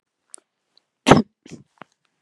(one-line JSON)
{"cough_length": "2.2 s", "cough_amplitude": 32768, "cough_signal_mean_std_ratio": 0.19, "survey_phase": "beta (2021-08-13 to 2022-03-07)", "age": "18-44", "gender": "Female", "wearing_mask": "No", "symptom_runny_or_blocked_nose": true, "smoker_status": "Never smoked", "respiratory_condition_asthma": false, "respiratory_condition_other": false, "recruitment_source": "REACT", "submission_delay": "2 days", "covid_test_result": "Negative", "covid_test_method": "RT-qPCR", "influenza_a_test_result": "Negative", "influenza_b_test_result": "Negative"}